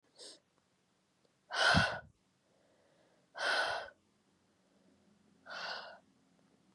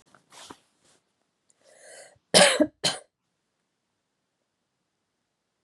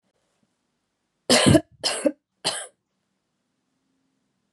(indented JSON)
{
  "exhalation_length": "6.7 s",
  "exhalation_amplitude": 6252,
  "exhalation_signal_mean_std_ratio": 0.33,
  "cough_length": "5.6 s",
  "cough_amplitude": 26832,
  "cough_signal_mean_std_ratio": 0.21,
  "three_cough_length": "4.5 s",
  "three_cough_amplitude": 22070,
  "three_cough_signal_mean_std_ratio": 0.28,
  "survey_phase": "beta (2021-08-13 to 2022-03-07)",
  "age": "18-44",
  "gender": "Female",
  "wearing_mask": "No",
  "symptom_runny_or_blocked_nose": true,
  "symptom_headache": true,
  "symptom_onset": "12 days",
  "smoker_status": "Never smoked",
  "respiratory_condition_asthma": false,
  "respiratory_condition_other": false,
  "recruitment_source": "REACT",
  "submission_delay": "1 day",
  "covid_test_result": "Negative",
  "covid_test_method": "RT-qPCR",
  "influenza_a_test_result": "Negative",
  "influenza_b_test_result": "Negative"
}